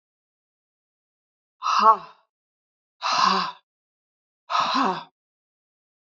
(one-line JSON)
{"exhalation_length": "6.1 s", "exhalation_amplitude": 25487, "exhalation_signal_mean_std_ratio": 0.35, "survey_phase": "beta (2021-08-13 to 2022-03-07)", "age": "65+", "gender": "Female", "wearing_mask": "No", "symptom_none": true, "smoker_status": "Never smoked", "respiratory_condition_asthma": false, "respiratory_condition_other": false, "recruitment_source": "REACT", "submission_delay": "1 day", "covid_test_result": "Negative", "covid_test_method": "RT-qPCR", "influenza_a_test_result": "Negative", "influenza_b_test_result": "Negative"}